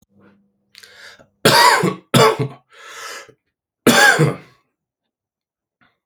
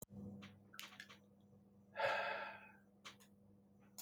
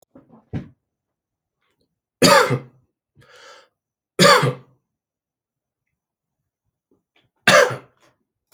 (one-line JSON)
{"cough_length": "6.1 s", "cough_amplitude": 32768, "cough_signal_mean_std_ratio": 0.38, "exhalation_length": "4.0 s", "exhalation_amplitude": 1486, "exhalation_signal_mean_std_ratio": 0.47, "three_cough_length": "8.5 s", "three_cough_amplitude": 32768, "three_cough_signal_mean_std_ratio": 0.26, "survey_phase": "beta (2021-08-13 to 2022-03-07)", "age": "18-44", "gender": "Male", "wearing_mask": "No", "symptom_cough_any": true, "symptom_new_continuous_cough": true, "symptom_sore_throat": true, "symptom_headache": true, "symptom_onset": "12 days", "smoker_status": "Ex-smoker", "respiratory_condition_asthma": false, "respiratory_condition_other": false, "recruitment_source": "REACT", "submission_delay": "8 days", "covid_test_result": "Negative", "covid_test_method": "RT-qPCR", "influenza_a_test_result": "Negative", "influenza_b_test_result": "Negative"}